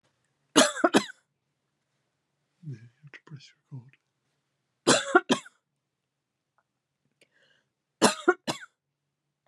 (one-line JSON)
{"three_cough_length": "9.5 s", "three_cough_amplitude": 21268, "three_cough_signal_mean_std_ratio": 0.23, "survey_phase": "beta (2021-08-13 to 2022-03-07)", "age": "45-64", "gender": "Female", "wearing_mask": "No", "symptom_cough_any": true, "symptom_runny_or_blocked_nose": true, "symptom_abdominal_pain": true, "symptom_fatigue": true, "symptom_fever_high_temperature": true, "symptom_headache": true, "symptom_other": true, "smoker_status": "Never smoked", "respiratory_condition_asthma": false, "respiratory_condition_other": false, "recruitment_source": "Test and Trace", "submission_delay": "1 day", "covid_test_result": "Positive", "covid_test_method": "RT-qPCR"}